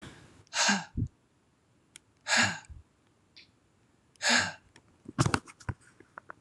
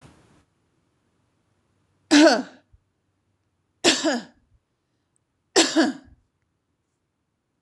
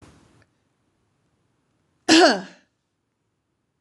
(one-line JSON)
{"exhalation_length": "6.4 s", "exhalation_amplitude": 10896, "exhalation_signal_mean_std_ratio": 0.35, "three_cough_length": "7.6 s", "three_cough_amplitude": 25208, "three_cough_signal_mean_std_ratio": 0.27, "cough_length": "3.8 s", "cough_amplitude": 25992, "cough_signal_mean_std_ratio": 0.23, "survey_phase": "beta (2021-08-13 to 2022-03-07)", "age": "45-64", "gender": "Female", "wearing_mask": "No", "symptom_none": true, "smoker_status": "Never smoked", "respiratory_condition_asthma": false, "respiratory_condition_other": false, "recruitment_source": "REACT", "submission_delay": "3 days", "covid_test_result": "Negative", "covid_test_method": "RT-qPCR", "influenza_a_test_result": "Negative", "influenza_b_test_result": "Negative"}